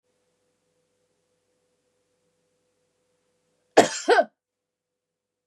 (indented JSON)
{
  "cough_length": "5.5 s",
  "cough_amplitude": 28842,
  "cough_signal_mean_std_ratio": 0.18,
  "survey_phase": "beta (2021-08-13 to 2022-03-07)",
  "age": "65+",
  "gender": "Female",
  "wearing_mask": "No",
  "symptom_fatigue": true,
  "symptom_headache": true,
  "smoker_status": "Never smoked",
  "respiratory_condition_asthma": false,
  "respiratory_condition_other": false,
  "recruitment_source": "REACT",
  "submission_delay": "2 days",
  "covid_test_result": "Negative",
  "covid_test_method": "RT-qPCR",
  "influenza_a_test_result": "Negative",
  "influenza_b_test_result": "Negative"
}